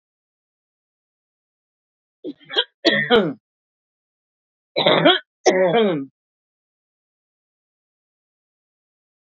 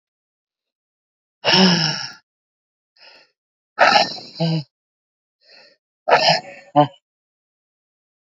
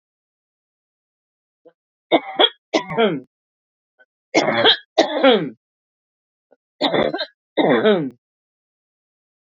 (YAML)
cough_length: 9.2 s
cough_amplitude: 27883
cough_signal_mean_std_ratio: 0.32
exhalation_length: 8.4 s
exhalation_amplitude: 30261
exhalation_signal_mean_std_ratio: 0.34
three_cough_length: 9.6 s
three_cough_amplitude: 29295
three_cough_signal_mean_std_ratio: 0.37
survey_phase: beta (2021-08-13 to 2022-03-07)
age: 45-64
gender: Female
wearing_mask: 'No'
symptom_none: true
smoker_status: Current smoker (1 to 10 cigarettes per day)
respiratory_condition_asthma: false
respiratory_condition_other: false
recruitment_source: REACT
submission_delay: 2 days
covid_test_result: Negative
covid_test_method: RT-qPCR
influenza_a_test_result: Unknown/Void
influenza_b_test_result: Unknown/Void